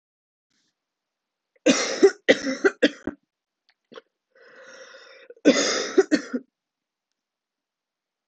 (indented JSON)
{
  "cough_length": "8.3 s",
  "cough_amplitude": 24845,
  "cough_signal_mean_std_ratio": 0.3,
  "survey_phase": "alpha (2021-03-01 to 2021-08-12)",
  "age": "18-44",
  "gender": "Female",
  "wearing_mask": "No",
  "symptom_cough_any": true,
  "symptom_new_continuous_cough": true,
  "symptom_shortness_of_breath": true,
  "symptom_fatigue": true,
  "symptom_fever_high_temperature": true,
  "symptom_headache": true,
  "symptom_change_to_sense_of_smell_or_taste": true,
  "symptom_loss_of_taste": true,
  "symptom_onset": "3 days",
  "smoker_status": "Never smoked",
  "respiratory_condition_asthma": true,
  "respiratory_condition_other": false,
  "recruitment_source": "Test and Trace",
  "submission_delay": "2 days",
  "covid_test_result": "Positive",
  "covid_test_method": "RT-qPCR"
}